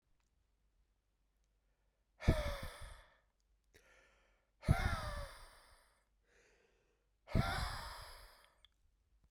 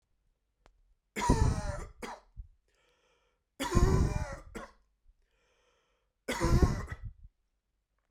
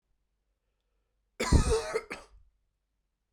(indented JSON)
{
  "exhalation_length": "9.3 s",
  "exhalation_amplitude": 4763,
  "exhalation_signal_mean_std_ratio": 0.31,
  "three_cough_length": "8.1 s",
  "three_cough_amplitude": 9204,
  "three_cough_signal_mean_std_ratio": 0.38,
  "cough_length": "3.3 s",
  "cough_amplitude": 10075,
  "cough_signal_mean_std_ratio": 0.31,
  "survey_phase": "beta (2021-08-13 to 2022-03-07)",
  "age": "18-44",
  "gender": "Male",
  "wearing_mask": "No",
  "symptom_runny_or_blocked_nose": true,
  "smoker_status": "Never smoked",
  "respiratory_condition_asthma": false,
  "respiratory_condition_other": false,
  "recruitment_source": "Test and Trace",
  "submission_delay": "2 days",
  "covid_test_result": "Positive",
  "covid_test_method": "RT-qPCR",
  "covid_ct_value": 29.5,
  "covid_ct_gene": "ORF1ab gene",
  "covid_ct_mean": 31.1,
  "covid_viral_load": "62 copies/ml",
  "covid_viral_load_category": "Minimal viral load (< 10K copies/ml)"
}